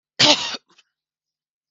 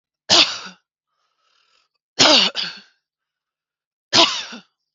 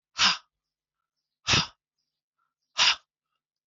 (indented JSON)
{
  "cough_length": "1.7 s",
  "cough_amplitude": 32104,
  "cough_signal_mean_std_ratio": 0.3,
  "three_cough_length": "4.9 s",
  "three_cough_amplitude": 32767,
  "three_cough_signal_mean_std_ratio": 0.33,
  "exhalation_length": "3.7 s",
  "exhalation_amplitude": 14442,
  "exhalation_signal_mean_std_ratio": 0.29,
  "survey_phase": "alpha (2021-03-01 to 2021-08-12)",
  "age": "45-64",
  "gender": "Female",
  "wearing_mask": "No",
  "symptom_cough_any": true,
  "smoker_status": "Never smoked",
  "respiratory_condition_asthma": true,
  "respiratory_condition_other": false,
  "recruitment_source": "REACT",
  "submission_delay": "1 day",
  "covid_test_result": "Negative",
  "covid_test_method": "RT-qPCR"
}